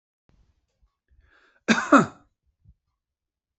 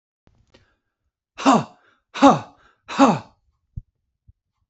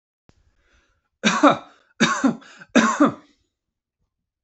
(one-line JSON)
{"cough_length": "3.6 s", "cough_amplitude": 26182, "cough_signal_mean_std_ratio": 0.21, "exhalation_length": "4.7 s", "exhalation_amplitude": 28644, "exhalation_signal_mean_std_ratio": 0.28, "three_cough_length": "4.4 s", "three_cough_amplitude": 28997, "three_cough_signal_mean_std_ratio": 0.36, "survey_phase": "beta (2021-08-13 to 2022-03-07)", "age": "45-64", "gender": "Male", "wearing_mask": "No", "symptom_none": true, "smoker_status": "Ex-smoker", "respiratory_condition_asthma": true, "respiratory_condition_other": false, "recruitment_source": "REACT", "submission_delay": "3 days", "covid_test_result": "Negative", "covid_test_method": "RT-qPCR", "influenza_a_test_result": "Unknown/Void", "influenza_b_test_result": "Unknown/Void"}